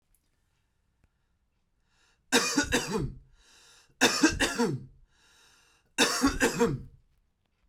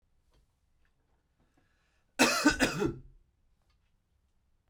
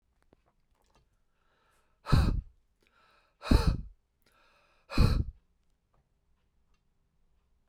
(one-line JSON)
{"three_cough_length": "7.7 s", "three_cough_amplitude": 14759, "three_cough_signal_mean_std_ratio": 0.42, "cough_length": "4.7 s", "cough_amplitude": 11156, "cough_signal_mean_std_ratio": 0.29, "exhalation_length": "7.7 s", "exhalation_amplitude": 10947, "exhalation_signal_mean_std_ratio": 0.27, "survey_phase": "beta (2021-08-13 to 2022-03-07)", "age": "18-44", "gender": "Male", "wearing_mask": "No", "symptom_none": true, "smoker_status": "Never smoked", "respiratory_condition_asthma": false, "respiratory_condition_other": false, "recruitment_source": "REACT", "submission_delay": "0 days", "covid_test_result": "Negative", "covid_test_method": "RT-qPCR"}